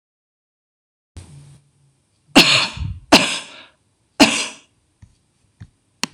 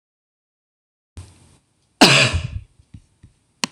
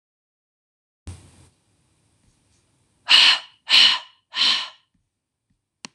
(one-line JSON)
{"three_cough_length": "6.1 s", "three_cough_amplitude": 26028, "three_cough_signal_mean_std_ratio": 0.29, "cough_length": "3.7 s", "cough_amplitude": 26028, "cough_signal_mean_std_ratio": 0.27, "exhalation_length": "5.9 s", "exhalation_amplitude": 26028, "exhalation_signal_mean_std_ratio": 0.3, "survey_phase": "beta (2021-08-13 to 2022-03-07)", "age": "45-64", "gender": "Female", "wearing_mask": "No", "symptom_none": true, "smoker_status": "Never smoked", "respiratory_condition_asthma": false, "respiratory_condition_other": false, "recruitment_source": "REACT", "submission_delay": "3 days", "covid_test_result": "Negative", "covid_test_method": "RT-qPCR", "influenza_a_test_result": "Negative", "influenza_b_test_result": "Negative"}